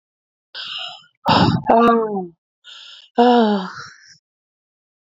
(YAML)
exhalation_length: 5.1 s
exhalation_amplitude: 28693
exhalation_signal_mean_std_ratio: 0.46
survey_phase: alpha (2021-03-01 to 2021-08-12)
age: 18-44
gender: Female
wearing_mask: 'No'
symptom_headache: true
smoker_status: Never smoked
respiratory_condition_asthma: true
respiratory_condition_other: false
recruitment_source: Test and Trace
submission_delay: 2 days
covid_test_result: Positive
covid_test_method: RT-qPCR